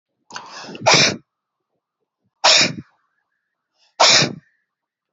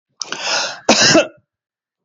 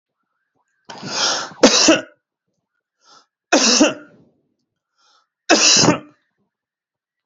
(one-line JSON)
{"exhalation_length": "5.1 s", "exhalation_amplitude": 31378, "exhalation_signal_mean_std_ratio": 0.35, "cough_length": "2.0 s", "cough_amplitude": 32767, "cough_signal_mean_std_ratio": 0.47, "three_cough_length": "7.3 s", "three_cough_amplitude": 32768, "three_cough_signal_mean_std_ratio": 0.37, "survey_phase": "beta (2021-08-13 to 2022-03-07)", "age": "18-44", "gender": "Male", "wearing_mask": "No", "symptom_none": true, "smoker_status": "Never smoked", "respiratory_condition_asthma": false, "respiratory_condition_other": false, "recruitment_source": "Test and Trace", "submission_delay": "0 days", "covid_test_result": "Negative", "covid_test_method": "LFT"}